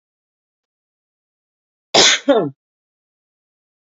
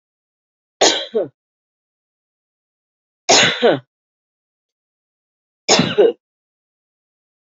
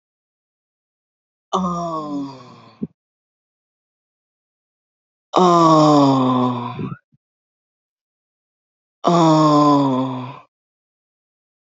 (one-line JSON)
{"cough_length": "3.9 s", "cough_amplitude": 31439, "cough_signal_mean_std_ratio": 0.26, "three_cough_length": "7.5 s", "three_cough_amplitude": 30364, "three_cough_signal_mean_std_ratio": 0.3, "exhalation_length": "11.6 s", "exhalation_amplitude": 28429, "exhalation_signal_mean_std_ratio": 0.43, "survey_phase": "beta (2021-08-13 to 2022-03-07)", "age": "45-64", "gender": "Female", "wearing_mask": "No", "symptom_diarrhoea": true, "symptom_headache": true, "smoker_status": "Current smoker (e-cigarettes or vapes only)", "respiratory_condition_asthma": false, "respiratory_condition_other": false, "recruitment_source": "Test and Trace", "submission_delay": "1 day", "covid_test_result": "Negative", "covid_test_method": "LAMP"}